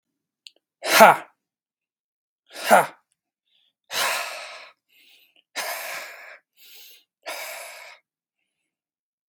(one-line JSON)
{"exhalation_length": "9.3 s", "exhalation_amplitude": 32767, "exhalation_signal_mean_std_ratio": 0.25, "survey_phase": "beta (2021-08-13 to 2022-03-07)", "age": "18-44", "gender": "Male", "wearing_mask": "No", "symptom_none": true, "symptom_onset": "2 days", "smoker_status": "Ex-smoker", "respiratory_condition_asthma": false, "respiratory_condition_other": false, "recruitment_source": "Test and Trace", "submission_delay": "1 day", "covid_test_result": "Negative", "covid_test_method": "RT-qPCR"}